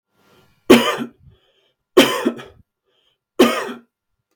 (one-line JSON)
{"three_cough_length": "4.4 s", "three_cough_amplitude": 32768, "three_cough_signal_mean_std_ratio": 0.32, "survey_phase": "beta (2021-08-13 to 2022-03-07)", "age": "45-64", "gender": "Male", "wearing_mask": "No", "symptom_cough_any": true, "symptom_sore_throat": true, "symptom_onset": "6 days", "smoker_status": "Never smoked", "respiratory_condition_asthma": true, "respiratory_condition_other": false, "recruitment_source": "REACT", "submission_delay": "2 days", "covid_test_result": "Negative", "covid_test_method": "RT-qPCR", "influenza_a_test_result": "Negative", "influenza_b_test_result": "Negative"}